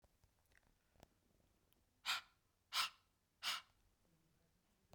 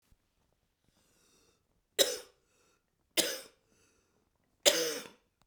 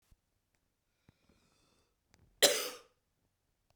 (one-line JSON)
{"exhalation_length": "4.9 s", "exhalation_amplitude": 1669, "exhalation_signal_mean_std_ratio": 0.27, "three_cough_length": "5.5 s", "three_cough_amplitude": 14759, "three_cough_signal_mean_std_ratio": 0.25, "cough_length": "3.8 s", "cough_amplitude": 14068, "cough_signal_mean_std_ratio": 0.18, "survey_phase": "beta (2021-08-13 to 2022-03-07)", "age": "18-44", "gender": "Female", "wearing_mask": "No", "symptom_cough_any": true, "symptom_runny_or_blocked_nose": true, "symptom_change_to_sense_of_smell_or_taste": true, "smoker_status": "Never smoked", "respiratory_condition_asthma": false, "respiratory_condition_other": true, "recruitment_source": "Test and Trace", "submission_delay": "2 days", "covid_test_result": "Positive", "covid_test_method": "RT-qPCR", "covid_ct_value": 23.5, "covid_ct_gene": "ORF1ab gene"}